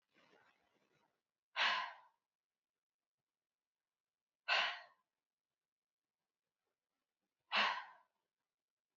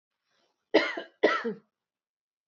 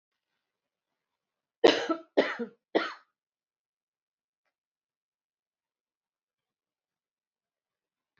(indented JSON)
{
  "exhalation_length": "9.0 s",
  "exhalation_amplitude": 2836,
  "exhalation_signal_mean_std_ratio": 0.25,
  "cough_length": "2.5 s",
  "cough_amplitude": 13131,
  "cough_signal_mean_std_ratio": 0.32,
  "three_cough_length": "8.2 s",
  "three_cough_amplitude": 14898,
  "three_cough_signal_mean_std_ratio": 0.18,
  "survey_phase": "alpha (2021-03-01 to 2021-08-12)",
  "age": "45-64",
  "gender": "Female",
  "wearing_mask": "No",
  "symptom_none": true,
  "smoker_status": "Never smoked",
  "respiratory_condition_asthma": false,
  "respiratory_condition_other": false,
  "recruitment_source": "REACT",
  "submission_delay": "3 days",
  "covid_test_result": "Negative",
  "covid_test_method": "RT-qPCR"
}